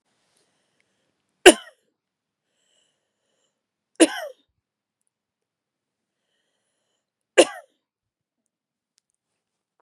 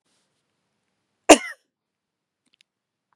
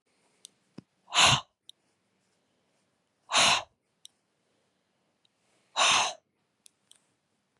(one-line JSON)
{"three_cough_length": "9.8 s", "three_cough_amplitude": 32768, "three_cough_signal_mean_std_ratio": 0.12, "cough_length": "3.2 s", "cough_amplitude": 32768, "cough_signal_mean_std_ratio": 0.12, "exhalation_length": "7.6 s", "exhalation_amplitude": 13677, "exhalation_signal_mean_std_ratio": 0.27, "survey_phase": "beta (2021-08-13 to 2022-03-07)", "age": "18-44", "gender": "Female", "wearing_mask": "No", "symptom_none": true, "smoker_status": "Never smoked", "respiratory_condition_asthma": true, "respiratory_condition_other": false, "recruitment_source": "REACT", "submission_delay": "2 days", "covid_test_result": "Negative", "covid_test_method": "RT-qPCR", "influenza_a_test_result": "Negative", "influenza_b_test_result": "Negative"}